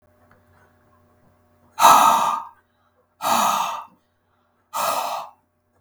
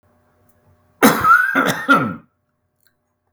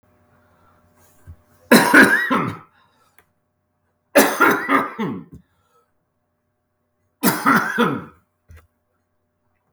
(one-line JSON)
{"exhalation_length": "5.8 s", "exhalation_amplitude": 32768, "exhalation_signal_mean_std_ratio": 0.39, "cough_length": "3.3 s", "cough_amplitude": 32768, "cough_signal_mean_std_ratio": 0.43, "three_cough_length": "9.7 s", "three_cough_amplitude": 32768, "three_cough_signal_mean_std_ratio": 0.36, "survey_phase": "beta (2021-08-13 to 2022-03-07)", "age": "65+", "gender": "Male", "wearing_mask": "No", "symptom_cough_any": true, "symptom_runny_or_blocked_nose": true, "symptom_onset": "11 days", "smoker_status": "Ex-smoker", "respiratory_condition_asthma": false, "respiratory_condition_other": false, "recruitment_source": "REACT", "submission_delay": "1 day", "covid_test_result": "Negative", "covid_test_method": "RT-qPCR", "influenza_a_test_result": "Negative", "influenza_b_test_result": "Negative"}